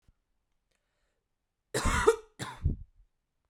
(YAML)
cough_length: 3.5 s
cough_amplitude: 13222
cough_signal_mean_std_ratio: 0.31
survey_phase: beta (2021-08-13 to 2022-03-07)
age: 18-44
gender: Female
wearing_mask: 'No'
symptom_cough_any: true
symptom_sore_throat: true
symptom_fatigue: true
symptom_headache: true
symptom_other: true
symptom_onset: 3 days
smoker_status: Ex-smoker
respiratory_condition_asthma: false
respiratory_condition_other: false
recruitment_source: Test and Trace
submission_delay: 2 days
covid_test_result: Positive
covid_test_method: RT-qPCR
covid_ct_value: 33.4
covid_ct_gene: N gene